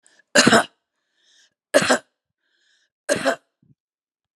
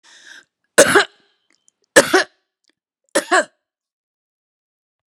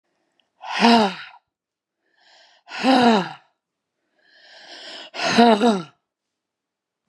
{"cough_length": "4.4 s", "cough_amplitude": 31848, "cough_signal_mean_std_ratio": 0.3, "three_cough_length": "5.1 s", "three_cough_amplitude": 32768, "three_cough_signal_mean_std_ratio": 0.27, "exhalation_length": "7.1 s", "exhalation_amplitude": 31389, "exhalation_signal_mean_std_ratio": 0.37, "survey_phase": "beta (2021-08-13 to 2022-03-07)", "age": "65+", "gender": "Female", "wearing_mask": "No", "symptom_cough_any": true, "symptom_sore_throat": true, "symptom_fatigue": true, "symptom_headache": true, "smoker_status": "Never smoked", "respiratory_condition_asthma": false, "respiratory_condition_other": false, "recruitment_source": "Test and Trace", "submission_delay": "2 days", "covid_test_result": "Positive", "covid_test_method": "RT-qPCR", "covid_ct_value": 25.4, "covid_ct_gene": "ORF1ab gene", "covid_ct_mean": 25.8, "covid_viral_load": "3400 copies/ml", "covid_viral_load_category": "Minimal viral load (< 10K copies/ml)"}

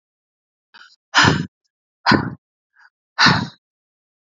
{"exhalation_length": "4.4 s", "exhalation_amplitude": 30184, "exhalation_signal_mean_std_ratio": 0.32, "survey_phase": "beta (2021-08-13 to 2022-03-07)", "age": "18-44", "gender": "Female", "wearing_mask": "No", "symptom_cough_any": true, "symptom_runny_or_blocked_nose": true, "symptom_fatigue": true, "symptom_headache": true, "smoker_status": "Never smoked", "respiratory_condition_asthma": false, "respiratory_condition_other": false, "recruitment_source": "Test and Trace", "submission_delay": "1 day", "covid_test_result": "Positive", "covid_test_method": "RT-qPCR", "covid_ct_value": 30.6, "covid_ct_gene": "ORF1ab gene"}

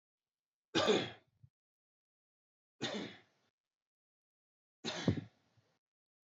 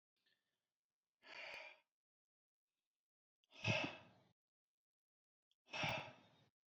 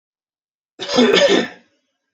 {"three_cough_length": "6.3 s", "three_cough_amplitude": 4845, "three_cough_signal_mean_std_ratio": 0.27, "exhalation_length": "6.7 s", "exhalation_amplitude": 1565, "exhalation_signal_mean_std_ratio": 0.29, "cough_length": "2.1 s", "cough_amplitude": 29249, "cough_signal_mean_std_ratio": 0.45, "survey_phase": "alpha (2021-03-01 to 2021-08-12)", "age": "18-44", "gender": "Male", "wearing_mask": "No", "symptom_none": true, "smoker_status": "Never smoked", "respiratory_condition_asthma": false, "respiratory_condition_other": false, "recruitment_source": "Test and Trace", "submission_delay": "0 days", "covid_test_result": "Negative", "covid_test_method": "LFT"}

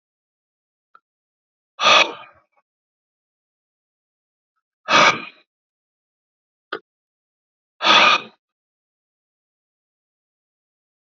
{"exhalation_length": "11.2 s", "exhalation_amplitude": 28251, "exhalation_signal_mean_std_ratio": 0.23, "survey_phase": "alpha (2021-03-01 to 2021-08-12)", "age": "45-64", "gender": "Male", "wearing_mask": "No", "symptom_cough_any": true, "symptom_headache": true, "symptom_onset": "7 days", "smoker_status": "Never smoked", "respiratory_condition_asthma": false, "respiratory_condition_other": false, "recruitment_source": "Test and Trace", "submission_delay": "2 days", "covid_test_result": "Positive", "covid_test_method": "RT-qPCR", "covid_ct_value": 15.3, "covid_ct_gene": "ORF1ab gene", "covid_ct_mean": 15.7, "covid_viral_load": "7300000 copies/ml", "covid_viral_load_category": "High viral load (>1M copies/ml)"}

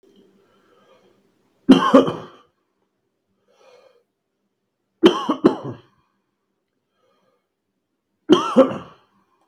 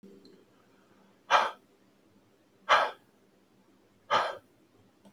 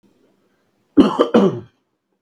{"three_cough_length": "9.5 s", "three_cough_amplitude": 32768, "three_cough_signal_mean_std_ratio": 0.25, "exhalation_length": "5.1 s", "exhalation_amplitude": 10957, "exhalation_signal_mean_std_ratio": 0.29, "cough_length": "2.2 s", "cough_amplitude": 32768, "cough_signal_mean_std_ratio": 0.35, "survey_phase": "beta (2021-08-13 to 2022-03-07)", "age": "45-64", "gender": "Male", "wearing_mask": "No", "symptom_runny_or_blocked_nose": true, "symptom_shortness_of_breath": true, "symptom_fatigue": true, "symptom_onset": "4 days", "smoker_status": "Ex-smoker", "respiratory_condition_asthma": true, "respiratory_condition_other": false, "recruitment_source": "REACT", "submission_delay": "2 days", "covid_test_result": "Negative", "covid_test_method": "RT-qPCR"}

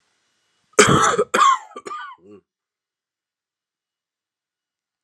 {"cough_length": "5.0 s", "cough_amplitude": 32767, "cough_signal_mean_std_ratio": 0.31, "survey_phase": "alpha (2021-03-01 to 2021-08-12)", "age": "45-64", "gender": "Male", "wearing_mask": "No", "symptom_cough_any": true, "symptom_new_continuous_cough": true, "symptom_shortness_of_breath": true, "symptom_fatigue": true, "symptom_headache": true, "symptom_change_to_sense_of_smell_or_taste": true, "symptom_loss_of_taste": true, "symptom_onset": "3 days", "smoker_status": "Never smoked", "respiratory_condition_asthma": false, "respiratory_condition_other": false, "recruitment_source": "Test and Trace", "submission_delay": "1 day", "covid_test_result": "Positive", "covid_test_method": "RT-qPCR", "covid_ct_value": 23.7, "covid_ct_gene": "ORF1ab gene"}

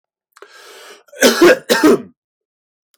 {"cough_length": "3.0 s", "cough_amplitude": 32767, "cough_signal_mean_std_ratio": 0.39, "survey_phase": "beta (2021-08-13 to 2022-03-07)", "age": "18-44", "gender": "Male", "wearing_mask": "No", "symptom_none": true, "smoker_status": "Never smoked", "respiratory_condition_asthma": false, "respiratory_condition_other": false, "recruitment_source": "REACT", "submission_delay": "4 days", "covid_test_result": "Negative", "covid_test_method": "RT-qPCR", "influenza_a_test_result": "Negative", "influenza_b_test_result": "Negative"}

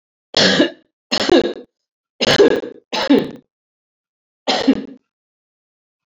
{"three_cough_length": "6.1 s", "three_cough_amplitude": 30698, "three_cough_signal_mean_std_ratio": 0.42, "survey_phase": "beta (2021-08-13 to 2022-03-07)", "age": "45-64", "gender": "Female", "wearing_mask": "No", "symptom_cough_any": true, "symptom_runny_or_blocked_nose": true, "symptom_fatigue": true, "symptom_headache": true, "symptom_onset": "5 days", "smoker_status": "Ex-smoker", "respiratory_condition_asthma": false, "respiratory_condition_other": false, "recruitment_source": "Test and Trace", "submission_delay": "1 day", "covid_test_result": "Positive", "covid_test_method": "RT-qPCR"}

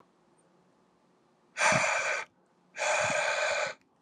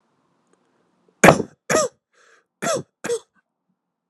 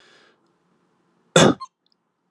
{"exhalation_length": "4.0 s", "exhalation_amplitude": 8878, "exhalation_signal_mean_std_ratio": 0.56, "cough_length": "4.1 s", "cough_amplitude": 32768, "cough_signal_mean_std_ratio": 0.26, "three_cough_length": "2.3 s", "three_cough_amplitude": 32390, "three_cough_signal_mean_std_ratio": 0.23, "survey_phase": "beta (2021-08-13 to 2022-03-07)", "age": "18-44", "gender": "Male", "wearing_mask": "No", "symptom_none": true, "smoker_status": "Never smoked", "respiratory_condition_asthma": false, "respiratory_condition_other": false, "recruitment_source": "REACT", "submission_delay": "1 day", "covid_test_result": "Negative", "covid_test_method": "RT-qPCR"}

